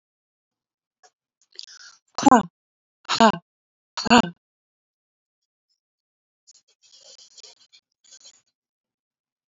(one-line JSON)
{"exhalation_length": "9.5 s", "exhalation_amplitude": 26983, "exhalation_signal_mean_std_ratio": 0.18, "survey_phase": "beta (2021-08-13 to 2022-03-07)", "age": "45-64", "gender": "Female", "wearing_mask": "No", "symptom_none": true, "smoker_status": "Ex-smoker", "respiratory_condition_asthma": false, "respiratory_condition_other": false, "recruitment_source": "REACT", "submission_delay": "2 days", "covid_test_result": "Negative", "covid_test_method": "RT-qPCR", "influenza_a_test_result": "Negative", "influenza_b_test_result": "Negative"}